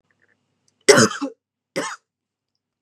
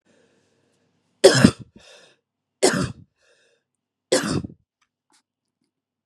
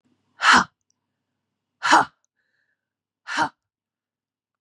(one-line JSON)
{"cough_length": "2.8 s", "cough_amplitude": 32768, "cough_signal_mean_std_ratio": 0.26, "three_cough_length": "6.1 s", "three_cough_amplitude": 32768, "three_cough_signal_mean_std_ratio": 0.25, "exhalation_length": "4.6 s", "exhalation_amplitude": 26353, "exhalation_signal_mean_std_ratio": 0.26, "survey_phase": "beta (2021-08-13 to 2022-03-07)", "age": "45-64", "gender": "Female", "wearing_mask": "No", "symptom_runny_or_blocked_nose": true, "symptom_sore_throat": true, "symptom_headache": true, "smoker_status": "Never smoked", "respiratory_condition_asthma": false, "respiratory_condition_other": false, "recruitment_source": "REACT", "submission_delay": "2 days", "covid_test_result": "Negative", "covid_test_method": "RT-qPCR", "influenza_a_test_result": "Negative", "influenza_b_test_result": "Negative"}